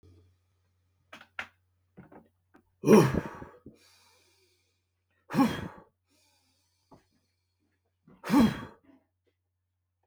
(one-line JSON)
{"exhalation_length": "10.1 s", "exhalation_amplitude": 14260, "exhalation_signal_mean_std_ratio": 0.24, "survey_phase": "beta (2021-08-13 to 2022-03-07)", "age": "45-64", "gender": "Male", "wearing_mask": "No", "symptom_none": true, "smoker_status": "Never smoked", "respiratory_condition_asthma": false, "respiratory_condition_other": false, "recruitment_source": "REACT", "submission_delay": "0 days", "covid_test_result": "Negative", "covid_test_method": "RT-qPCR"}